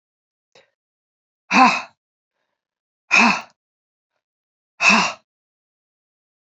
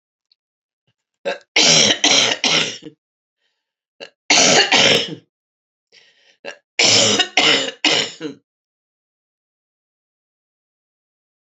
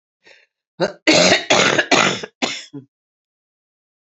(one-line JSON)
{"exhalation_length": "6.5 s", "exhalation_amplitude": 29313, "exhalation_signal_mean_std_ratio": 0.28, "three_cough_length": "11.4 s", "three_cough_amplitude": 32768, "three_cough_signal_mean_std_ratio": 0.41, "cough_length": "4.2 s", "cough_amplitude": 32263, "cough_signal_mean_std_ratio": 0.43, "survey_phase": "beta (2021-08-13 to 2022-03-07)", "age": "65+", "gender": "Female", "wearing_mask": "No", "symptom_cough_any": true, "symptom_runny_or_blocked_nose": true, "symptom_fatigue": true, "symptom_headache": true, "symptom_change_to_sense_of_smell_or_taste": true, "symptom_onset": "3 days", "smoker_status": "Ex-smoker", "respiratory_condition_asthma": true, "respiratory_condition_other": false, "recruitment_source": "Test and Trace", "submission_delay": "2 days", "covid_test_result": "Positive", "covid_test_method": "RT-qPCR"}